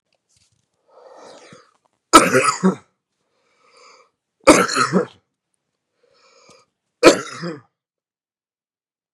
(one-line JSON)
{"three_cough_length": "9.1 s", "three_cough_amplitude": 32768, "three_cough_signal_mean_std_ratio": 0.27, "survey_phase": "beta (2021-08-13 to 2022-03-07)", "age": "45-64", "gender": "Male", "wearing_mask": "No", "symptom_cough_any": true, "symptom_runny_or_blocked_nose": true, "symptom_sore_throat": true, "symptom_fatigue": true, "symptom_fever_high_temperature": true, "symptom_headache": true, "symptom_onset": "4 days", "smoker_status": "Ex-smoker", "respiratory_condition_asthma": false, "respiratory_condition_other": false, "recruitment_source": "Test and Trace", "submission_delay": "2 days", "covid_test_result": "Positive", "covid_test_method": "RT-qPCR", "covid_ct_value": 17.6, "covid_ct_gene": "ORF1ab gene", "covid_ct_mean": 17.8, "covid_viral_load": "1500000 copies/ml", "covid_viral_load_category": "High viral load (>1M copies/ml)"}